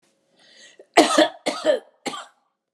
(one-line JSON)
{"cough_length": "2.7 s", "cough_amplitude": 32768, "cough_signal_mean_std_ratio": 0.36, "survey_phase": "alpha (2021-03-01 to 2021-08-12)", "age": "45-64", "gender": "Female", "wearing_mask": "No", "symptom_none": true, "smoker_status": "Never smoked", "respiratory_condition_asthma": false, "respiratory_condition_other": false, "recruitment_source": "REACT", "submission_delay": "1 day", "covid_test_result": "Negative", "covid_test_method": "RT-qPCR"}